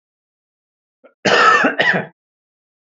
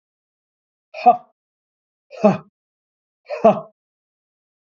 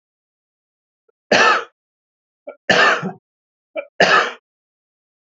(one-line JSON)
{"cough_length": "3.0 s", "cough_amplitude": 29810, "cough_signal_mean_std_ratio": 0.41, "exhalation_length": "4.6 s", "exhalation_amplitude": 29293, "exhalation_signal_mean_std_ratio": 0.23, "three_cough_length": "5.4 s", "three_cough_amplitude": 32072, "three_cough_signal_mean_std_ratio": 0.35, "survey_phase": "beta (2021-08-13 to 2022-03-07)", "age": "45-64", "gender": "Male", "wearing_mask": "No", "symptom_none": true, "smoker_status": "Never smoked", "respiratory_condition_asthma": false, "respiratory_condition_other": false, "recruitment_source": "REACT", "submission_delay": "1 day", "covid_test_result": "Negative", "covid_test_method": "RT-qPCR", "influenza_a_test_result": "Unknown/Void", "influenza_b_test_result": "Unknown/Void"}